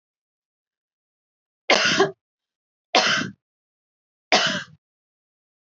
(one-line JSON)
{"three_cough_length": "5.7 s", "three_cough_amplitude": 26156, "three_cough_signal_mean_std_ratio": 0.32, "survey_phase": "alpha (2021-03-01 to 2021-08-12)", "age": "18-44", "gender": "Female", "wearing_mask": "No", "symptom_none": true, "smoker_status": "Never smoked", "respiratory_condition_asthma": false, "respiratory_condition_other": false, "recruitment_source": "REACT", "submission_delay": "1 day", "covid_test_result": "Negative", "covid_test_method": "RT-qPCR"}